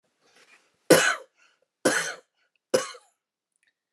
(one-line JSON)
{"three_cough_length": "3.9 s", "three_cough_amplitude": 23155, "three_cough_signal_mean_std_ratio": 0.28, "survey_phase": "beta (2021-08-13 to 2022-03-07)", "age": "45-64", "gender": "Male", "wearing_mask": "No", "symptom_none": true, "smoker_status": "Never smoked", "respiratory_condition_asthma": false, "respiratory_condition_other": false, "recruitment_source": "REACT", "submission_delay": "1 day", "covid_test_result": "Negative", "covid_test_method": "RT-qPCR"}